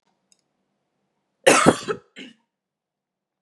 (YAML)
cough_length: 3.4 s
cough_amplitude: 32768
cough_signal_mean_std_ratio: 0.24
survey_phase: beta (2021-08-13 to 2022-03-07)
age: 18-44
gender: Female
wearing_mask: 'No'
symptom_cough_any: true
symptom_runny_or_blocked_nose: true
symptom_headache: true
symptom_onset: 2 days
smoker_status: Never smoked
respiratory_condition_asthma: false
respiratory_condition_other: false
recruitment_source: Test and Trace
submission_delay: 1 day
covid_test_result: Positive
covid_test_method: RT-qPCR
covid_ct_value: 17.1
covid_ct_gene: N gene